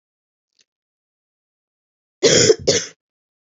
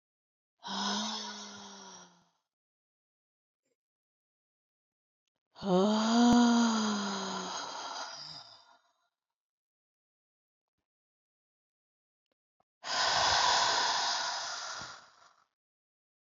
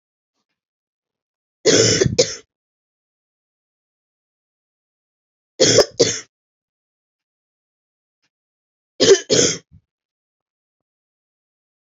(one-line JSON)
{"cough_length": "3.6 s", "cough_amplitude": 28809, "cough_signal_mean_std_ratio": 0.29, "exhalation_length": "16.2 s", "exhalation_amplitude": 6008, "exhalation_signal_mean_std_ratio": 0.43, "three_cough_length": "11.9 s", "three_cough_amplitude": 31852, "three_cough_signal_mean_std_ratio": 0.26, "survey_phase": "beta (2021-08-13 to 2022-03-07)", "age": "45-64", "gender": "Female", "wearing_mask": "No", "symptom_runny_or_blocked_nose": true, "symptom_abdominal_pain": true, "symptom_onset": "2 days", "smoker_status": "Never smoked", "respiratory_condition_asthma": false, "respiratory_condition_other": false, "recruitment_source": "Test and Trace", "submission_delay": "1 day", "covid_test_result": "Positive", "covid_test_method": "RT-qPCR", "covid_ct_value": 17.7, "covid_ct_gene": "ORF1ab gene", "covid_ct_mean": 18.2, "covid_viral_load": "1100000 copies/ml", "covid_viral_load_category": "High viral load (>1M copies/ml)"}